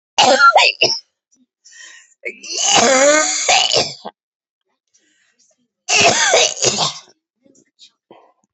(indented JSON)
{
  "three_cough_length": "8.5 s",
  "three_cough_amplitude": 32368,
  "three_cough_signal_mean_std_ratio": 0.5,
  "survey_phase": "beta (2021-08-13 to 2022-03-07)",
  "age": "45-64",
  "gender": "Female",
  "wearing_mask": "No",
  "symptom_cough_any": true,
  "symptom_new_continuous_cough": true,
  "symptom_runny_or_blocked_nose": true,
  "symptom_shortness_of_breath": true,
  "symptom_sore_throat": true,
  "symptom_fatigue": true,
  "symptom_headache": true,
  "symptom_onset": "3 days",
  "smoker_status": "Never smoked",
  "respiratory_condition_asthma": true,
  "respiratory_condition_other": false,
  "recruitment_source": "Test and Trace",
  "submission_delay": "1 day",
  "covid_test_result": "Negative",
  "covid_test_method": "RT-qPCR"
}